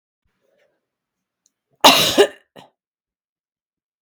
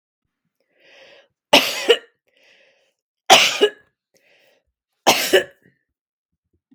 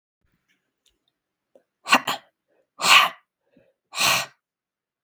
{"cough_length": "4.0 s", "cough_amplitude": 32768, "cough_signal_mean_std_ratio": 0.24, "three_cough_length": "6.7 s", "three_cough_amplitude": 32768, "three_cough_signal_mean_std_ratio": 0.28, "exhalation_length": "5.0 s", "exhalation_amplitude": 32768, "exhalation_signal_mean_std_ratio": 0.28, "survey_phase": "beta (2021-08-13 to 2022-03-07)", "age": "45-64", "gender": "Female", "wearing_mask": "No", "symptom_sore_throat": true, "symptom_onset": "6 days", "smoker_status": "Ex-smoker", "respiratory_condition_asthma": false, "respiratory_condition_other": false, "recruitment_source": "REACT", "submission_delay": "3 days", "covid_test_result": "Negative", "covid_test_method": "RT-qPCR", "influenza_a_test_result": "Negative", "influenza_b_test_result": "Negative"}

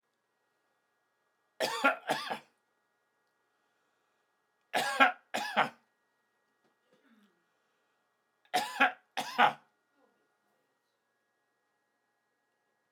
{"three_cough_length": "12.9 s", "three_cough_amplitude": 14476, "three_cough_signal_mean_std_ratio": 0.25, "survey_phase": "alpha (2021-03-01 to 2021-08-12)", "age": "65+", "gender": "Male", "wearing_mask": "No", "symptom_none": true, "smoker_status": "Ex-smoker", "respiratory_condition_asthma": false, "respiratory_condition_other": false, "recruitment_source": "REACT", "submission_delay": "2 days", "covid_test_result": "Negative", "covid_test_method": "RT-qPCR"}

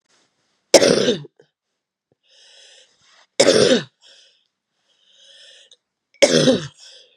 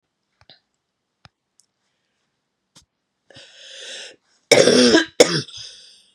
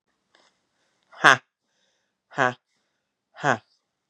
{"three_cough_length": "7.2 s", "three_cough_amplitude": 32768, "three_cough_signal_mean_std_ratio": 0.32, "cough_length": "6.1 s", "cough_amplitude": 32768, "cough_signal_mean_std_ratio": 0.28, "exhalation_length": "4.1 s", "exhalation_amplitude": 32768, "exhalation_signal_mean_std_ratio": 0.18, "survey_phase": "beta (2021-08-13 to 2022-03-07)", "age": "45-64", "gender": "Female", "wearing_mask": "No", "symptom_cough_any": true, "symptom_new_continuous_cough": true, "symptom_runny_or_blocked_nose": true, "symptom_shortness_of_breath": true, "symptom_sore_throat": true, "symptom_fatigue": true, "symptom_fever_high_temperature": true, "symptom_headache": true, "symptom_change_to_sense_of_smell_or_taste": true, "symptom_onset": "3 days", "smoker_status": "Ex-smoker", "respiratory_condition_asthma": false, "respiratory_condition_other": false, "recruitment_source": "Test and Trace", "submission_delay": "1 day", "covid_test_result": "Positive", "covid_test_method": "RT-qPCR", "covid_ct_value": 25.7, "covid_ct_gene": "S gene", "covid_ct_mean": 25.8, "covid_viral_load": "3500 copies/ml", "covid_viral_load_category": "Minimal viral load (< 10K copies/ml)"}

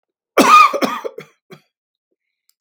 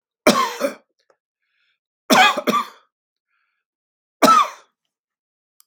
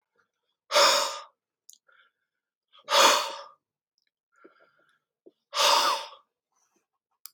{"cough_length": "2.6 s", "cough_amplitude": 32768, "cough_signal_mean_std_ratio": 0.36, "three_cough_length": "5.7 s", "three_cough_amplitude": 32767, "three_cough_signal_mean_std_ratio": 0.33, "exhalation_length": "7.3 s", "exhalation_amplitude": 18566, "exhalation_signal_mean_std_ratio": 0.33, "survey_phase": "beta (2021-08-13 to 2022-03-07)", "age": "65+", "gender": "Male", "wearing_mask": "No", "symptom_none": true, "smoker_status": "Never smoked", "respiratory_condition_asthma": false, "respiratory_condition_other": false, "recruitment_source": "REACT", "submission_delay": "1 day", "covid_test_result": "Negative", "covid_test_method": "RT-qPCR", "influenza_a_test_result": "Negative", "influenza_b_test_result": "Negative"}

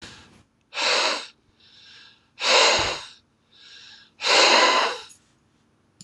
{"exhalation_length": "6.0 s", "exhalation_amplitude": 23273, "exhalation_signal_mean_std_ratio": 0.46, "survey_phase": "beta (2021-08-13 to 2022-03-07)", "age": "65+", "gender": "Male", "wearing_mask": "No", "symptom_cough_any": true, "symptom_runny_or_blocked_nose": true, "symptom_shortness_of_breath": true, "symptom_fatigue": true, "symptom_loss_of_taste": true, "smoker_status": "Never smoked", "respiratory_condition_asthma": true, "respiratory_condition_other": false, "recruitment_source": "REACT", "submission_delay": "1 day", "covid_test_result": "Negative", "covid_test_method": "RT-qPCR", "influenza_a_test_result": "Negative", "influenza_b_test_result": "Negative"}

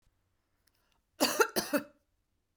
{"cough_length": "2.6 s", "cough_amplitude": 8656, "cough_signal_mean_std_ratio": 0.3, "survey_phase": "beta (2021-08-13 to 2022-03-07)", "age": "45-64", "gender": "Female", "wearing_mask": "No", "symptom_none": true, "smoker_status": "Ex-smoker", "respiratory_condition_asthma": false, "respiratory_condition_other": false, "recruitment_source": "REACT", "submission_delay": "2 days", "covid_test_result": "Negative", "covid_test_method": "RT-qPCR", "influenza_a_test_result": "Negative", "influenza_b_test_result": "Negative"}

